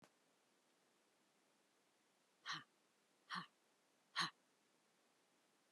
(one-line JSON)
{"exhalation_length": "5.7 s", "exhalation_amplitude": 1357, "exhalation_signal_mean_std_ratio": 0.25, "survey_phase": "beta (2021-08-13 to 2022-03-07)", "age": "65+", "gender": "Female", "wearing_mask": "No", "symptom_none": true, "symptom_onset": "5 days", "smoker_status": "Never smoked", "respiratory_condition_asthma": false, "respiratory_condition_other": false, "recruitment_source": "REACT", "submission_delay": "3 days", "covid_test_result": "Negative", "covid_test_method": "RT-qPCR", "influenza_a_test_result": "Negative", "influenza_b_test_result": "Negative"}